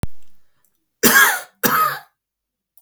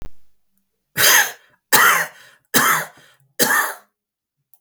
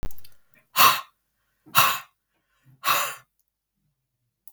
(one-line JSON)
{"cough_length": "2.8 s", "cough_amplitude": 32768, "cough_signal_mean_std_ratio": 0.47, "three_cough_length": "4.6 s", "three_cough_amplitude": 32766, "three_cough_signal_mean_std_ratio": 0.45, "exhalation_length": "4.5 s", "exhalation_amplitude": 32766, "exhalation_signal_mean_std_ratio": 0.34, "survey_phase": "beta (2021-08-13 to 2022-03-07)", "age": "45-64", "gender": "Male", "wearing_mask": "No", "symptom_none": true, "smoker_status": "Ex-smoker", "respiratory_condition_asthma": false, "respiratory_condition_other": false, "recruitment_source": "REACT", "submission_delay": "1 day", "covid_test_result": "Negative", "covid_test_method": "RT-qPCR", "covid_ct_value": 37.0, "covid_ct_gene": "N gene", "influenza_a_test_result": "Negative", "influenza_b_test_result": "Negative"}